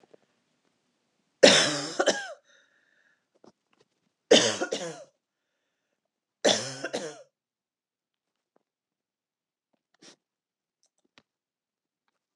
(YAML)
three_cough_length: 12.4 s
three_cough_amplitude: 27831
three_cough_signal_mean_std_ratio: 0.23
survey_phase: beta (2021-08-13 to 2022-03-07)
age: 65+
gender: Female
wearing_mask: 'No'
symptom_none: true
smoker_status: Never smoked
respiratory_condition_asthma: false
respiratory_condition_other: false
recruitment_source: REACT
submission_delay: 1 day
covid_test_result: Negative
covid_test_method: RT-qPCR
influenza_a_test_result: Negative
influenza_b_test_result: Negative